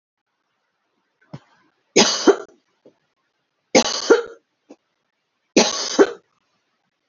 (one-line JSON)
{"three_cough_length": "7.1 s", "three_cough_amplitude": 32767, "three_cough_signal_mean_std_ratio": 0.29, "survey_phase": "alpha (2021-03-01 to 2021-08-12)", "age": "45-64", "gender": "Female", "wearing_mask": "No", "symptom_none": true, "smoker_status": "Never smoked", "respiratory_condition_asthma": false, "respiratory_condition_other": false, "recruitment_source": "REACT", "submission_delay": "1 day", "covid_test_result": "Negative", "covid_test_method": "RT-qPCR"}